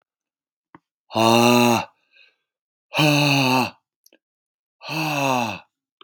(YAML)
exhalation_length: 6.0 s
exhalation_amplitude: 28465
exhalation_signal_mean_std_ratio: 0.47
survey_phase: beta (2021-08-13 to 2022-03-07)
age: 45-64
gender: Male
wearing_mask: 'No'
symptom_cough_any: true
symptom_runny_or_blocked_nose: true
symptom_shortness_of_breath: true
symptom_onset: 4 days
smoker_status: Never smoked
respiratory_condition_asthma: false
respiratory_condition_other: false
recruitment_source: Test and Trace
submission_delay: 1 day
covid_test_result: Positive
covid_test_method: RT-qPCR
covid_ct_value: 23.4
covid_ct_gene: N gene